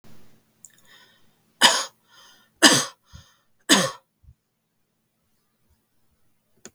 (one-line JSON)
{"three_cough_length": "6.7 s", "three_cough_amplitude": 32768, "three_cough_signal_mean_std_ratio": 0.24, "survey_phase": "beta (2021-08-13 to 2022-03-07)", "age": "45-64", "gender": "Female", "wearing_mask": "No", "symptom_none": true, "smoker_status": "Never smoked", "respiratory_condition_asthma": false, "respiratory_condition_other": false, "recruitment_source": "REACT", "submission_delay": "1 day", "covid_test_result": "Negative", "covid_test_method": "RT-qPCR", "influenza_a_test_result": "Negative", "influenza_b_test_result": "Negative"}